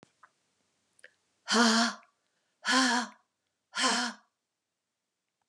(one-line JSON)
{"exhalation_length": "5.5 s", "exhalation_amplitude": 9473, "exhalation_signal_mean_std_ratio": 0.38, "survey_phase": "beta (2021-08-13 to 2022-03-07)", "age": "45-64", "gender": "Female", "wearing_mask": "No", "symptom_none": true, "smoker_status": "Never smoked", "respiratory_condition_asthma": false, "respiratory_condition_other": false, "recruitment_source": "REACT", "submission_delay": "2 days", "covid_test_result": "Negative", "covid_test_method": "RT-qPCR"}